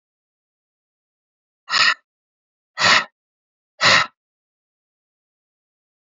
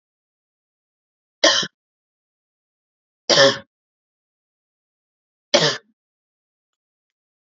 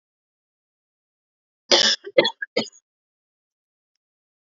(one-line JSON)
{"exhalation_length": "6.1 s", "exhalation_amplitude": 26469, "exhalation_signal_mean_std_ratio": 0.27, "three_cough_length": "7.6 s", "three_cough_amplitude": 32767, "three_cough_signal_mean_std_ratio": 0.23, "cough_length": "4.4 s", "cough_amplitude": 28112, "cough_signal_mean_std_ratio": 0.24, "survey_phase": "alpha (2021-03-01 to 2021-08-12)", "age": "18-44", "gender": "Female", "wearing_mask": "No", "symptom_none": true, "symptom_onset": "8 days", "smoker_status": "Ex-smoker", "respiratory_condition_asthma": false, "respiratory_condition_other": false, "recruitment_source": "REACT", "submission_delay": "2 days", "covid_test_result": "Negative", "covid_test_method": "RT-qPCR"}